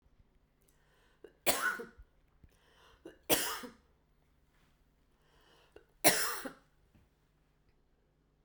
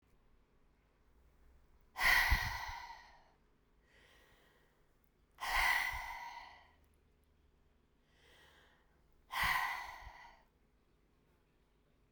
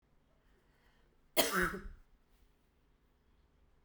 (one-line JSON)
{"three_cough_length": "8.4 s", "three_cough_amplitude": 10466, "three_cough_signal_mean_std_ratio": 0.27, "exhalation_length": "12.1 s", "exhalation_amplitude": 3964, "exhalation_signal_mean_std_ratio": 0.35, "cough_length": "3.8 s", "cough_amplitude": 8230, "cough_signal_mean_std_ratio": 0.27, "survey_phase": "beta (2021-08-13 to 2022-03-07)", "age": "45-64", "gender": "Female", "wearing_mask": "No", "symptom_none": true, "smoker_status": "Ex-smoker", "respiratory_condition_asthma": false, "respiratory_condition_other": false, "recruitment_source": "REACT", "submission_delay": "2 days", "covid_test_result": "Negative", "covid_test_method": "RT-qPCR"}